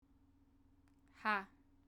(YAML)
exhalation_length: 1.9 s
exhalation_amplitude: 2339
exhalation_signal_mean_std_ratio: 0.28
survey_phase: beta (2021-08-13 to 2022-03-07)
age: 18-44
gender: Female
wearing_mask: 'No'
symptom_none: true
smoker_status: Ex-smoker
respiratory_condition_asthma: false
respiratory_condition_other: false
recruitment_source: REACT
submission_delay: 1 day
covid_test_result: Negative
covid_test_method: RT-qPCR